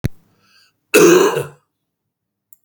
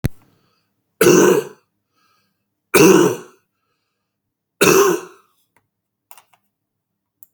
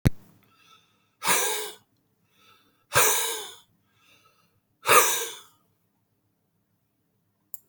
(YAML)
cough_length: 2.6 s
cough_amplitude: 32767
cough_signal_mean_std_ratio: 0.37
three_cough_length: 7.3 s
three_cough_amplitude: 32768
three_cough_signal_mean_std_ratio: 0.34
exhalation_length: 7.7 s
exhalation_amplitude: 26526
exhalation_signal_mean_std_ratio: 0.32
survey_phase: beta (2021-08-13 to 2022-03-07)
age: 65+
gender: Male
wearing_mask: 'No'
symptom_cough_any: true
symptom_sore_throat: true
symptom_diarrhoea: true
symptom_fatigue: true
smoker_status: Ex-smoker
respiratory_condition_asthma: false
respiratory_condition_other: false
recruitment_source: REACT
submission_delay: 9 days
covid_test_result: Negative
covid_test_method: RT-qPCR
influenza_a_test_result: Negative
influenza_b_test_result: Negative